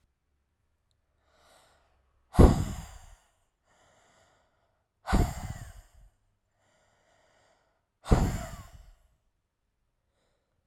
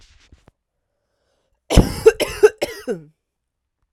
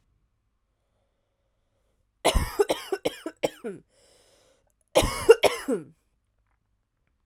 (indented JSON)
{
  "exhalation_length": "10.7 s",
  "exhalation_amplitude": 20576,
  "exhalation_signal_mean_std_ratio": 0.21,
  "three_cough_length": "3.9 s",
  "three_cough_amplitude": 32768,
  "three_cough_signal_mean_std_ratio": 0.26,
  "cough_length": "7.3 s",
  "cough_amplitude": 30068,
  "cough_signal_mean_std_ratio": 0.27,
  "survey_phase": "alpha (2021-03-01 to 2021-08-12)",
  "age": "18-44",
  "gender": "Female",
  "wearing_mask": "No",
  "symptom_fatigue": true,
  "symptom_change_to_sense_of_smell_or_taste": true,
  "symptom_loss_of_taste": true,
  "smoker_status": "Current smoker (1 to 10 cigarettes per day)",
  "respiratory_condition_asthma": false,
  "respiratory_condition_other": false,
  "recruitment_source": "Test and Trace",
  "submission_delay": "2 days",
  "covid_test_result": "Positive",
  "covid_test_method": "LFT"
}